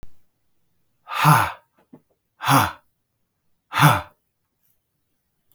{"exhalation_length": "5.5 s", "exhalation_amplitude": 31564, "exhalation_signal_mean_std_ratio": 0.31, "survey_phase": "beta (2021-08-13 to 2022-03-07)", "age": "45-64", "gender": "Male", "wearing_mask": "No", "symptom_none": true, "smoker_status": "Never smoked", "respiratory_condition_asthma": false, "respiratory_condition_other": false, "recruitment_source": "REACT", "submission_delay": "3 days", "covid_test_result": "Negative", "covid_test_method": "RT-qPCR", "influenza_a_test_result": "Negative", "influenza_b_test_result": "Negative"}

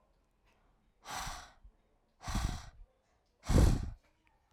{"exhalation_length": "4.5 s", "exhalation_amplitude": 6217, "exhalation_signal_mean_std_ratio": 0.33, "survey_phase": "alpha (2021-03-01 to 2021-08-12)", "age": "18-44", "gender": "Female", "wearing_mask": "No", "symptom_none": true, "smoker_status": "Never smoked", "respiratory_condition_asthma": false, "respiratory_condition_other": false, "recruitment_source": "REACT", "submission_delay": "3 days", "covid_test_result": "Negative", "covid_test_method": "RT-qPCR"}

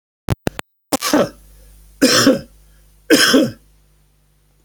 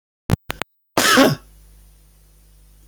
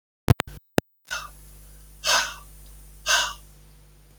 {"three_cough_length": "4.6 s", "three_cough_amplitude": 32767, "three_cough_signal_mean_std_ratio": 0.4, "cough_length": "2.9 s", "cough_amplitude": 32768, "cough_signal_mean_std_ratio": 0.31, "exhalation_length": "4.2 s", "exhalation_amplitude": 27924, "exhalation_signal_mean_std_ratio": 0.33, "survey_phase": "beta (2021-08-13 to 2022-03-07)", "age": "65+", "gender": "Male", "wearing_mask": "No", "symptom_none": true, "smoker_status": "Never smoked", "respiratory_condition_asthma": false, "respiratory_condition_other": false, "recruitment_source": "REACT", "submission_delay": "2 days", "covid_test_result": "Negative", "covid_test_method": "RT-qPCR", "influenza_a_test_result": "Negative", "influenza_b_test_result": "Negative"}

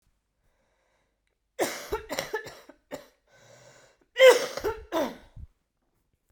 {"cough_length": "6.3 s", "cough_amplitude": 17885, "cough_signal_mean_std_ratio": 0.27, "survey_phase": "beta (2021-08-13 to 2022-03-07)", "age": "18-44", "gender": "Female", "wearing_mask": "No", "symptom_cough_any": true, "symptom_runny_or_blocked_nose": true, "symptom_sore_throat": true, "symptom_fatigue": true, "symptom_headache": true, "symptom_change_to_sense_of_smell_or_taste": true, "symptom_onset": "3 days", "smoker_status": "Never smoked", "respiratory_condition_asthma": false, "respiratory_condition_other": false, "recruitment_source": "Test and Trace", "submission_delay": "1 day", "covid_test_result": "Positive", "covid_test_method": "RT-qPCR", "covid_ct_value": 18.6, "covid_ct_gene": "ORF1ab gene"}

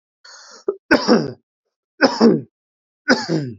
{"three_cough_length": "3.6 s", "three_cough_amplitude": 28387, "three_cough_signal_mean_std_ratio": 0.42, "survey_phase": "beta (2021-08-13 to 2022-03-07)", "age": "18-44", "gender": "Male", "wearing_mask": "No", "symptom_none": true, "smoker_status": "Ex-smoker", "respiratory_condition_asthma": false, "respiratory_condition_other": false, "recruitment_source": "REACT", "submission_delay": "2 days", "covid_test_result": "Negative", "covid_test_method": "RT-qPCR"}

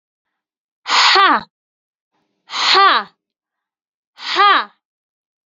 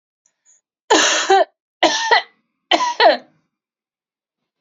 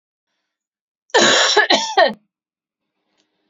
{"exhalation_length": "5.5 s", "exhalation_amplitude": 31235, "exhalation_signal_mean_std_ratio": 0.4, "three_cough_length": "4.6 s", "three_cough_amplitude": 31598, "three_cough_signal_mean_std_ratio": 0.41, "cough_length": "3.5 s", "cough_amplitude": 31692, "cough_signal_mean_std_ratio": 0.4, "survey_phase": "alpha (2021-03-01 to 2021-08-12)", "age": "18-44", "gender": "Female", "wearing_mask": "No", "symptom_none": true, "smoker_status": "Never smoked", "respiratory_condition_asthma": false, "respiratory_condition_other": false, "recruitment_source": "REACT", "submission_delay": "1 day", "covid_test_result": "Negative", "covid_test_method": "RT-qPCR"}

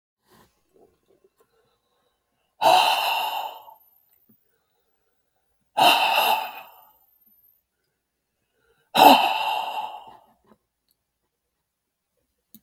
{"exhalation_length": "12.6 s", "exhalation_amplitude": 32180, "exhalation_signal_mean_std_ratio": 0.32, "survey_phase": "beta (2021-08-13 to 2022-03-07)", "age": "65+", "gender": "Male", "wearing_mask": "No", "symptom_none": true, "smoker_status": "Ex-smoker", "respiratory_condition_asthma": false, "respiratory_condition_other": false, "recruitment_source": "REACT", "submission_delay": "2 days", "covid_test_result": "Negative", "covid_test_method": "RT-qPCR", "influenza_a_test_result": "Negative", "influenza_b_test_result": "Negative"}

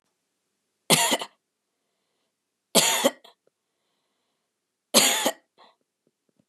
{"three_cough_length": "6.5 s", "three_cough_amplitude": 23568, "three_cough_signal_mean_std_ratio": 0.3, "survey_phase": "beta (2021-08-13 to 2022-03-07)", "age": "45-64", "gender": "Female", "wearing_mask": "No", "symptom_none": true, "smoker_status": "Never smoked", "respiratory_condition_asthma": false, "respiratory_condition_other": false, "recruitment_source": "Test and Trace", "submission_delay": "1 day", "covid_test_result": "Negative", "covid_test_method": "LFT"}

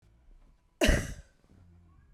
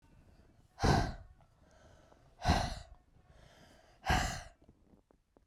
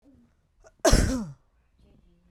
{"three_cough_length": "2.1 s", "three_cough_amplitude": 12071, "three_cough_signal_mean_std_ratio": 0.31, "exhalation_length": "5.5 s", "exhalation_amplitude": 5023, "exhalation_signal_mean_std_ratio": 0.36, "cough_length": "2.3 s", "cough_amplitude": 18376, "cough_signal_mean_std_ratio": 0.32, "survey_phase": "beta (2021-08-13 to 2022-03-07)", "age": "18-44", "gender": "Female", "wearing_mask": "No", "symptom_none": true, "smoker_status": "Never smoked", "respiratory_condition_asthma": false, "respiratory_condition_other": false, "recruitment_source": "REACT", "submission_delay": "2 days", "covid_test_result": "Negative", "covid_test_method": "RT-qPCR", "influenza_a_test_result": "Unknown/Void", "influenza_b_test_result": "Unknown/Void"}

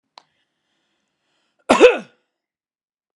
{"cough_length": "3.2 s", "cough_amplitude": 32767, "cough_signal_mean_std_ratio": 0.21, "survey_phase": "beta (2021-08-13 to 2022-03-07)", "age": "45-64", "gender": "Male", "wearing_mask": "No", "symptom_none": true, "smoker_status": "Never smoked", "respiratory_condition_asthma": false, "respiratory_condition_other": false, "recruitment_source": "REACT", "submission_delay": "1 day", "covid_test_result": "Negative", "covid_test_method": "RT-qPCR"}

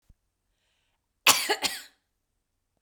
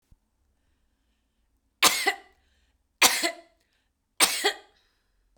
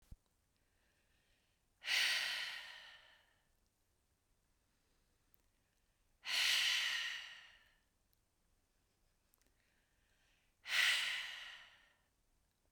{"cough_length": "2.8 s", "cough_amplitude": 23612, "cough_signal_mean_std_ratio": 0.25, "three_cough_length": "5.4 s", "three_cough_amplitude": 30351, "three_cough_signal_mean_std_ratio": 0.28, "exhalation_length": "12.7 s", "exhalation_amplitude": 3193, "exhalation_signal_mean_std_ratio": 0.37, "survey_phase": "beta (2021-08-13 to 2022-03-07)", "age": "18-44", "gender": "Female", "wearing_mask": "No", "symptom_sore_throat": true, "symptom_onset": "12 days", "smoker_status": "Never smoked", "respiratory_condition_asthma": false, "respiratory_condition_other": false, "recruitment_source": "REACT", "submission_delay": "1 day", "covid_test_result": "Negative", "covid_test_method": "RT-qPCR", "influenza_a_test_result": "Negative", "influenza_b_test_result": "Negative"}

